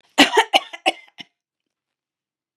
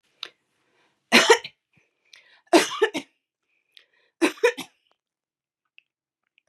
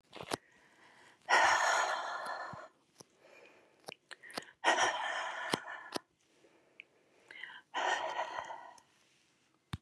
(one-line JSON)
{"cough_length": "2.6 s", "cough_amplitude": 32767, "cough_signal_mean_std_ratio": 0.27, "three_cough_length": "6.5 s", "three_cough_amplitude": 28093, "three_cough_signal_mean_std_ratio": 0.25, "exhalation_length": "9.8 s", "exhalation_amplitude": 7472, "exhalation_signal_mean_std_ratio": 0.45, "survey_phase": "beta (2021-08-13 to 2022-03-07)", "age": "65+", "gender": "Female", "wearing_mask": "No", "symptom_none": true, "smoker_status": "Ex-smoker", "respiratory_condition_asthma": false, "respiratory_condition_other": false, "recruitment_source": "REACT", "submission_delay": "2 days", "covid_test_result": "Negative", "covid_test_method": "RT-qPCR", "influenza_a_test_result": "Negative", "influenza_b_test_result": "Negative"}